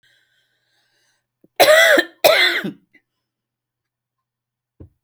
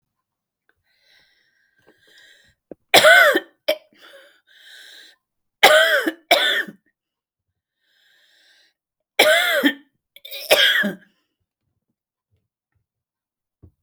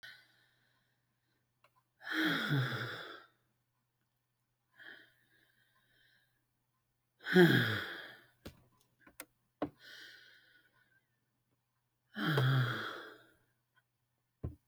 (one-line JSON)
{"cough_length": "5.0 s", "cough_amplitude": 32768, "cough_signal_mean_std_ratio": 0.33, "three_cough_length": "13.8 s", "three_cough_amplitude": 31277, "three_cough_signal_mean_std_ratio": 0.32, "exhalation_length": "14.7 s", "exhalation_amplitude": 7682, "exhalation_signal_mean_std_ratio": 0.31, "survey_phase": "alpha (2021-03-01 to 2021-08-12)", "age": "65+", "gender": "Female", "wearing_mask": "No", "symptom_none": true, "smoker_status": "Never smoked", "respiratory_condition_asthma": false, "respiratory_condition_other": false, "recruitment_source": "REACT", "submission_delay": "1 day", "covid_test_result": "Negative", "covid_test_method": "RT-qPCR"}